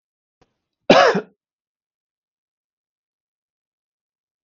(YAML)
cough_length: 4.4 s
cough_amplitude: 32768
cough_signal_mean_std_ratio: 0.19
survey_phase: beta (2021-08-13 to 2022-03-07)
age: 45-64
gender: Male
wearing_mask: 'No'
symptom_none: true
smoker_status: Ex-smoker
respiratory_condition_asthma: true
respiratory_condition_other: false
recruitment_source: REACT
submission_delay: 15 days
covid_test_result: Negative
covid_test_method: RT-qPCR